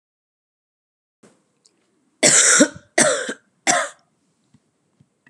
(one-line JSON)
{"three_cough_length": "5.3 s", "three_cough_amplitude": 32450, "three_cough_signal_mean_std_ratio": 0.33, "survey_phase": "beta (2021-08-13 to 2022-03-07)", "age": "18-44", "gender": "Female", "wearing_mask": "No", "symptom_cough_any": true, "symptom_sore_throat": true, "symptom_onset": "13 days", "smoker_status": "Current smoker (e-cigarettes or vapes only)", "respiratory_condition_asthma": true, "respiratory_condition_other": false, "recruitment_source": "REACT", "submission_delay": "2 days", "covid_test_result": "Negative", "covid_test_method": "RT-qPCR"}